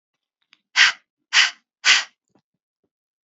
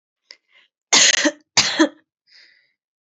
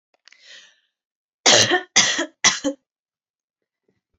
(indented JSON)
{
  "exhalation_length": "3.2 s",
  "exhalation_amplitude": 31885,
  "exhalation_signal_mean_std_ratio": 0.3,
  "cough_length": "3.1 s",
  "cough_amplitude": 32309,
  "cough_signal_mean_std_ratio": 0.35,
  "three_cough_length": "4.2 s",
  "three_cough_amplitude": 32767,
  "three_cough_signal_mean_std_ratio": 0.34,
  "survey_phase": "alpha (2021-03-01 to 2021-08-12)",
  "age": "18-44",
  "gender": "Female",
  "wearing_mask": "No",
  "symptom_none": true,
  "smoker_status": "Never smoked",
  "respiratory_condition_asthma": false,
  "respiratory_condition_other": false,
  "recruitment_source": "REACT",
  "submission_delay": "1 day",
  "covid_test_result": "Negative",
  "covid_test_method": "RT-qPCR"
}